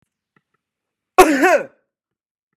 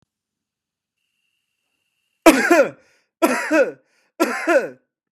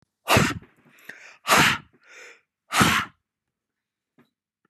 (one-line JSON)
{"cough_length": "2.6 s", "cough_amplitude": 32768, "cough_signal_mean_std_ratio": 0.31, "three_cough_length": "5.1 s", "three_cough_amplitude": 32767, "three_cough_signal_mean_std_ratio": 0.37, "exhalation_length": "4.7 s", "exhalation_amplitude": 23847, "exhalation_signal_mean_std_ratio": 0.35, "survey_phase": "beta (2021-08-13 to 2022-03-07)", "age": "45-64", "gender": "Male", "wearing_mask": "No", "symptom_none": true, "smoker_status": "Never smoked", "respiratory_condition_asthma": false, "respiratory_condition_other": false, "recruitment_source": "REACT", "submission_delay": "4 days", "covid_test_result": "Negative", "covid_test_method": "RT-qPCR", "covid_ct_value": 29.0, "covid_ct_gene": "N gene", "influenza_a_test_result": "Negative", "influenza_b_test_result": "Negative"}